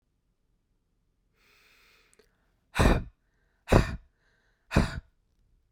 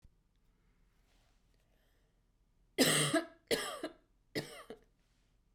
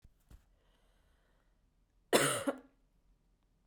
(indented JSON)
{
  "exhalation_length": "5.7 s",
  "exhalation_amplitude": 19594,
  "exhalation_signal_mean_std_ratio": 0.26,
  "three_cough_length": "5.5 s",
  "three_cough_amplitude": 6272,
  "three_cough_signal_mean_std_ratio": 0.31,
  "cough_length": "3.7 s",
  "cough_amplitude": 8470,
  "cough_signal_mean_std_ratio": 0.26,
  "survey_phase": "beta (2021-08-13 to 2022-03-07)",
  "age": "18-44",
  "gender": "Female",
  "wearing_mask": "No",
  "symptom_cough_any": true,
  "symptom_runny_or_blocked_nose": true,
  "symptom_sore_throat": true,
  "symptom_fatigue": true,
  "symptom_headache": true,
  "symptom_onset": "2 days",
  "smoker_status": "Never smoked",
  "respiratory_condition_asthma": false,
  "respiratory_condition_other": false,
  "recruitment_source": "Test and Trace",
  "submission_delay": "1 day",
  "covid_test_result": "Negative",
  "covid_test_method": "ePCR"
}